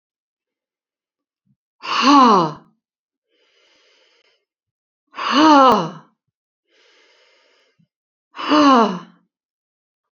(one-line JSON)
{"exhalation_length": "10.2 s", "exhalation_amplitude": 29339, "exhalation_signal_mean_std_ratio": 0.33, "survey_phase": "beta (2021-08-13 to 2022-03-07)", "age": "65+", "gender": "Female", "wearing_mask": "No", "symptom_none": true, "smoker_status": "Never smoked", "respiratory_condition_asthma": false, "respiratory_condition_other": false, "recruitment_source": "REACT", "submission_delay": "1 day", "covid_test_result": "Negative", "covid_test_method": "RT-qPCR"}